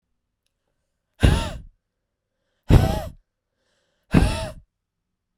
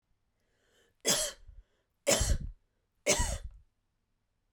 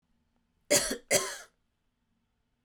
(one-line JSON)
{"exhalation_length": "5.4 s", "exhalation_amplitude": 32767, "exhalation_signal_mean_std_ratio": 0.29, "three_cough_length": "4.5 s", "three_cough_amplitude": 8793, "three_cough_signal_mean_std_ratio": 0.38, "cough_length": "2.6 s", "cough_amplitude": 10402, "cough_signal_mean_std_ratio": 0.31, "survey_phase": "beta (2021-08-13 to 2022-03-07)", "age": "18-44", "gender": "Female", "wearing_mask": "No", "symptom_none": true, "smoker_status": "Ex-smoker", "respiratory_condition_asthma": false, "respiratory_condition_other": false, "recruitment_source": "REACT", "submission_delay": "0 days", "covid_test_result": "Negative", "covid_test_method": "RT-qPCR", "influenza_a_test_result": "Negative", "influenza_b_test_result": "Negative"}